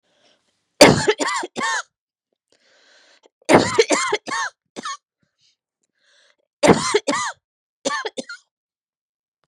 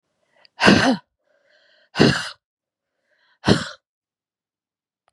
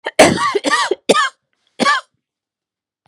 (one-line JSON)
{"three_cough_length": "9.5 s", "three_cough_amplitude": 32768, "three_cough_signal_mean_std_ratio": 0.34, "exhalation_length": "5.1 s", "exhalation_amplitude": 32763, "exhalation_signal_mean_std_ratio": 0.3, "cough_length": "3.1 s", "cough_amplitude": 32768, "cough_signal_mean_std_ratio": 0.46, "survey_phase": "beta (2021-08-13 to 2022-03-07)", "age": "45-64", "gender": "Female", "wearing_mask": "No", "symptom_cough_any": true, "symptom_runny_or_blocked_nose": true, "symptom_sore_throat": true, "symptom_headache": true, "symptom_onset": "8 days", "smoker_status": "Never smoked", "respiratory_condition_asthma": false, "respiratory_condition_other": false, "recruitment_source": "Test and Trace", "submission_delay": "1 day", "covid_test_result": "Positive", "covid_test_method": "RT-qPCR", "covid_ct_value": 28.4, "covid_ct_gene": "N gene"}